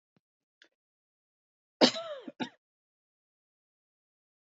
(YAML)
cough_length: 4.5 s
cough_amplitude: 14880
cough_signal_mean_std_ratio: 0.16
survey_phase: beta (2021-08-13 to 2022-03-07)
age: 45-64
gender: Female
wearing_mask: 'No'
symptom_cough_any: true
symptom_runny_or_blocked_nose: true
symptom_sore_throat: true
symptom_fatigue: true
symptom_onset: 5 days
smoker_status: Never smoked
respiratory_condition_asthma: false
respiratory_condition_other: false
recruitment_source: Test and Trace
submission_delay: 1 day
covid_test_result: Negative
covid_test_method: RT-qPCR